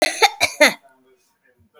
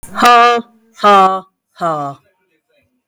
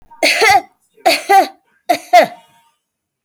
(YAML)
cough_length: 1.8 s
cough_amplitude: 32768
cough_signal_mean_std_ratio: 0.36
exhalation_length: 3.1 s
exhalation_amplitude: 32460
exhalation_signal_mean_std_ratio: 0.51
three_cough_length: 3.2 s
three_cough_amplitude: 32586
three_cough_signal_mean_std_ratio: 0.45
survey_phase: alpha (2021-03-01 to 2021-08-12)
age: 45-64
gender: Female
wearing_mask: 'No'
symptom_none: true
smoker_status: Never smoked
respiratory_condition_asthma: false
respiratory_condition_other: false
recruitment_source: REACT
submission_delay: 1 day
covid_test_result: Negative
covid_test_method: RT-qPCR